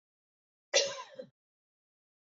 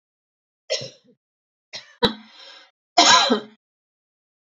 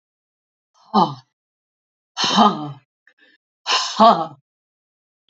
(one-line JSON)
{"cough_length": "2.2 s", "cough_amplitude": 8842, "cough_signal_mean_std_ratio": 0.25, "three_cough_length": "4.4 s", "three_cough_amplitude": 27614, "three_cough_signal_mean_std_ratio": 0.29, "exhalation_length": "5.3 s", "exhalation_amplitude": 28299, "exhalation_signal_mean_std_ratio": 0.34, "survey_phase": "beta (2021-08-13 to 2022-03-07)", "age": "65+", "gender": "Female", "wearing_mask": "No", "symptom_cough_any": true, "symptom_runny_or_blocked_nose": true, "smoker_status": "Never smoked", "respiratory_condition_asthma": false, "respiratory_condition_other": false, "recruitment_source": "REACT", "submission_delay": "2 days", "covid_test_result": "Negative", "covid_test_method": "RT-qPCR"}